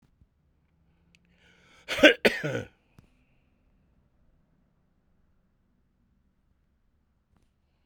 {"exhalation_length": "7.9 s", "exhalation_amplitude": 26886, "exhalation_signal_mean_std_ratio": 0.16, "survey_phase": "beta (2021-08-13 to 2022-03-07)", "age": "45-64", "gender": "Male", "wearing_mask": "No", "symptom_cough_any": true, "symptom_runny_or_blocked_nose": true, "symptom_sore_throat": true, "symptom_fatigue": true, "symptom_headache": true, "symptom_change_to_sense_of_smell_or_taste": true, "symptom_loss_of_taste": true, "symptom_onset": "6 days", "smoker_status": "Ex-smoker", "respiratory_condition_asthma": false, "respiratory_condition_other": false, "recruitment_source": "Test and Trace", "submission_delay": "1 day", "covid_test_result": "Positive", "covid_test_method": "ePCR"}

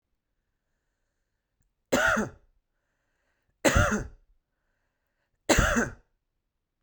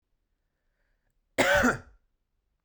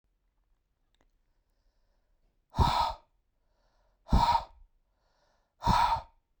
{"three_cough_length": "6.8 s", "three_cough_amplitude": 16509, "three_cough_signal_mean_std_ratio": 0.32, "cough_length": "2.6 s", "cough_amplitude": 11896, "cough_signal_mean_std_ratio": 0.31, "exhalation_length": "6.4 s", "exhalation_amplitude": 8445, "exhalation_signal_mean_std_ratio": 0.33, "survey_phase": "beta (2021-08-13 to 2022-03-07)", "age": "45-64", "gender": "Male", "wearing_mask": "No", "symptom_none": true, "smoker_status": "Ex-smoker", "respiratory_condition_asthma": false, "respiratory_condition_other": false, "recruitment_source": "REACT", "submission_delay": "3 days", "covid_test_result": "Negative", "covid_test_method": "RT-qPCR", "influenza_a_test_result": "Negative", "influenza_b_test_result": "Negative"}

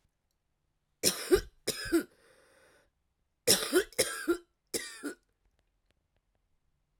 {"three_cough_length": "7.0 s", "three_cough_amplitude": 12294, "three_cough_signal_mean_std_ratio": 0.32, "survey_phase": "alpha (2021-03-01 to 2021-08-12)", "age": "45-64", "gender": "Female", "wearing_mask": "No", "symptom_cough_any": true, "symptom_new_continuous_cough": true, "symptom_fatigue": true, "symptom_headache": true, "symptom_onset": "2 days", "smoker_status": "Ex-smoker", "respiratory_condition_asthma": false, "respiratory_condition_other": false, "recruitment_source": "Test and Trace", "submission_delay": "1 day", "covid_test_result": "Positive", "covid_test_method": "RT-qPCR", "covid_ct_value": 18.2, "covid_ct_gene": "ORF1ab gene", "covid_ct_mean": 18.7, "covid_viral_load": "730000 copies/ml", "covid_viral_load_category": "Low viral load (10K-1M copies/ml)"}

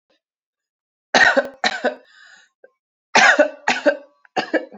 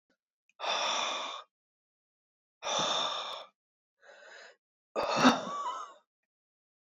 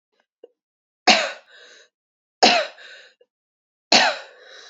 {"cough_length": "4.8 s", "cough_amplitude": 31488, "cough_signal_mean_std_ratio": 0.38, "exhalation_length": "6.9 s", "exhalation_amplitude": 9949, "exhalation_signal_mean_std_ratio": 0.44, "three_cough_length": "4.7 s", "three_cough_amplitude": 32767, "three_cough_signal_mean_std_ratio": 0.3, "survey_phase": "alpha (2021-03-01 to 2021-08-12)", "age": "18-44", "gender": "Female", "wearing_mask": "Yes", "symptom_shortness_of_breath": true, "symptom_abdominal_pain": true, "symptom_diarrhoea": true, "symptom_fatigue": true, "symptom_fever_high_temperature": true, "symptom_headache": true, "symptom_onset": "2 days", "smoker_status": "Ex-smoker", "respiratory_condition_asthma": true, "respiratory_condition_other": false, "recruitment_source": "Test and Trace", "submission_delay": "1 day", "covid_test_result": "Positive", "covid_test_method": "RT-qPCR", "covid_ct_value": 12.6, "covid_ct_gene": "ORF1ab gene", "covid_ct_mean": 13.0, "covid_viral_load": "55000000 copies/ml", "covid_viral_load_category": "High viral load (>1M copies/ml)"}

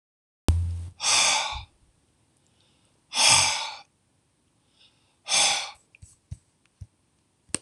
{"exhalation_length": "7.6 s", "exhalation_amplitude": 25498, "exhalation_signal_mean_std_ratio": 0.4, "survey_phase": "alpha (2021-03-01 to 2021-08-12)", "age": "65+", "gender": "Male", "wearing_mask": "No", "symptom_none": true, "smoker_status": "Ex-smoker", "respiratory_condition_asthma": false, "respiratory_condition_other": false, "recruitment_source": "REACT", "submission_delay": "1 day", "covid_test_result": "Negative", "covid_test_method": "RT-qPCR"}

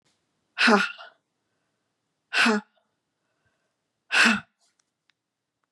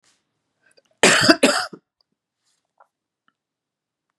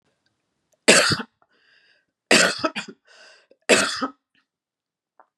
{"exhalation_length": "5.7 s", "exhalation_amplitude": 20931, "exhalation_signal_mean_std_ratio": 0.31, "cough_length": "4.2 s", "cough_amplitude": 32768, "cough_signal_mean_std_ratio": 0.27, "three_cough_length": "5.4 s", "three_cough_amplitude": 32055, "three_cough_signal_mean_std_ratio": 0.32, "survey_phase": "beta (2021-08-13 to 2022-03-07)", "age": "65+", "gender": "Female", "wearing_mask": "No", "symptom_cough_any": true, "symptom_runny_or_blocked_nose": true, "symptom_sore_throat": true, "symptom_fatigue": true, "symptom_onset": "7 days", "smoker_status": "Never smoked", "respiratory_condition_asthma": false, "respiratory_condition_other": false, "recruitment_source": "Test and Trace", "submission_delay": "4 days", "covid_test_result": "Negative", "covid_test_method": "RT-qPCR"}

